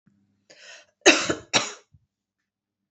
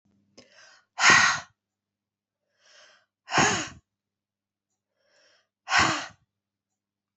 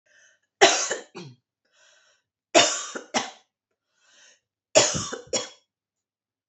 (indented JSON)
{
  "cough_length": "2.9 s",
  "cough_amplitude": 28530,
  "cough_signal_mean_std_ratio": 0.26,
  "exhalation_length": "7.2 s",
  "exhalation_amplitude": 21272,
  "exhalation_signal_mean_std_ratio": 0.29,
  "three_cough_length": "6.5 s",
  "three_cough_amplitude": 27925,
  "three_cough_signal_mean_std_ratio": 0.3,
  "survey_phase": "alpha (2021-03-01 to 2021-08-12)",
  "age": "45-64",
  "gender": "Female",
  "wearing_mask": "No",
  "symptom_cough_any": true,
  "smoker_status": "Ex-smoker",
  "respiratory_condition_asthma": false,
  "respiratory_condition_other": false,
  "recruitment_source": "REACT",
  "submission_delay": "3 days",
  "covid_test_result": "Negative",
  "covid_test_method": "RT-qPCR"
}